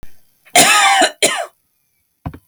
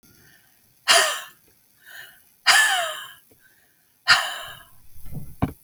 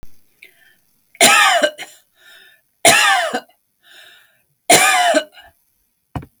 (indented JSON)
{
  "cough_length": "2.5 s",
  "cough_amplitude": 32768,
  "cough_signal_mean_std_ratio": 0.49,
  "exhalation_length": "5.6 s",
  "exhalation_amplitude": 27149,
  "exhalation_signal_mean_std_ratio": 0.39,
  "three_cough_length": "6.4 s",
  "three_cough_amplitude": 32768,
  "three_cough_signal_mean_std_ratio": 0.42,
  "survey_phase": "beta (2021-08-13 to 2022-03-07)",
  "age": "45-64",
  "gender": "Female",
  "wearing_mask": "No",
  "symptom_none": true,
  "smoker_status": "Never smoked",
  "respiratory_condition_asthma": false,
  "respiratory_condition_other": false,
  "recruitment_source": "REACT",
  "submission_delay": "1 day",
  "covid_test_result": "Negative",
  "covid_test_method": "RT-qPCR"
}